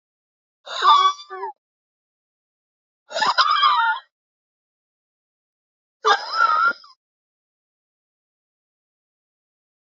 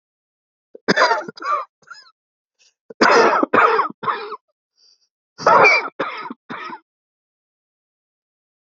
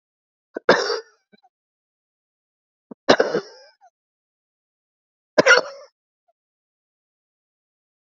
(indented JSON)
{
  "exhalation_length": "9.8 s",
  "exhalation_amplitude": 25234,
  "exhalation_signal_mean_std_ratio": 0.35,
  "cough_length": "8.8 s",
  "cough_amplitude": 28716,
  "cough_signal_mean_std_ratio": 0.39,
  "three_cough_length": "8.1 s",
  "three_cough_amplitude": 29881,
  "three_cough_signal_mean_std_ratio": 0.22,
  "survey_phase": "alpha (2021-03-01 to 2021-08-12)",
  "age": "45-64",
  "gender": "Female",
  "wearing_mask": "No",
  "symptom_cough_any": true,
  "symptom_fatigue": true,
  "symptom_change_to_sense_of_smell_or_taste": true,
  "symptom_loss_of_taste": true,
  "smoker_status": "Never smoked",
  "respiratory_condition_asthma": false,
  "respiratory_condition_other": false,
  "recruitment_source": "Test and Trace",
  "submission_delay": "3 days",
  "covid_test_result": "Positive",
  "covid_test_method": "RT-qPCR",
  "covid_ct_value": 18.2,
  "covid_ct_gene": "ORF1ab gene",
  "covid_ct_mean": 18.6,
  "covid_viral_load": "820000 copies/ml",
  "covid_viral_load_category": "Low viral load (10K-1M copies/ml)"
}